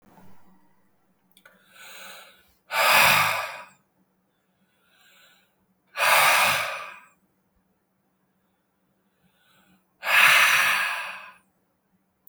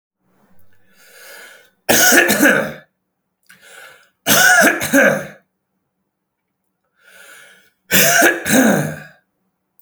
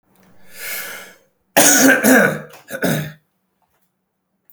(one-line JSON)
{"exhalation_length": "12.3 s", "exhalation_amplitude": 20944, "exhalation_signal_mean_std_ratio": 0.38, "three_cough_length": "9.8 s", "three_cough_amplitude": 32768, "three_cough_signal_mean_std_ratio": 0.44, "cough_length": "4.5 s", "cough_amplitude": 32768, "cough_signal_mean_std_ratio": 0.43, "survey_phase": "beta (2021-08-13 to 2022-03-07)", "age": "18-44", "gender": "Male", "wearing_mask": "No", "symptom_fatigue": true, "symptom_onset": "12 days", "smoker_status": "Prefer not to say", "respiratory_condition_asthma": true, "respiratory_condition_other": false, "recruitment_source": "REACT", "submission_delay": "1 day", "covid_test_result": "Negative", "covid_test_method": "RT-qPCR"}